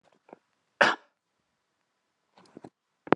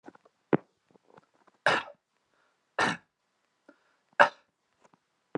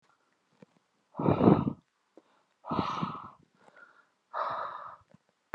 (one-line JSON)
{"cough_length": "3.2 s", "cough_amplitude": 27124, "cough_signal_mean_std_ratio": 0.15, "three_cough_length": "5.4 s", "three_cough_amplitude": 27046, "three_cough_signal_mean_std_ratio": 0.2, "exhalation_length": "5.5 s", "exhalation_amplitude": 16638, "exhalation_signal_mean_std_ratio": 0.34, "survey_phase": "alpha (2021-03-01 to 2021-08-12)", "age": "18-44", "gender": "Male", "wearing_mask": "No", "symptom_none": true, "smoker_status": "Never smoked", "respiratory_condition_asthma": false, "respiratory_condition_other": false, "recruitment_source": "REACT", "submission_delay": "2 days", "covid_test_result": "Negative", "covid_test_method": "RT-qPCR"}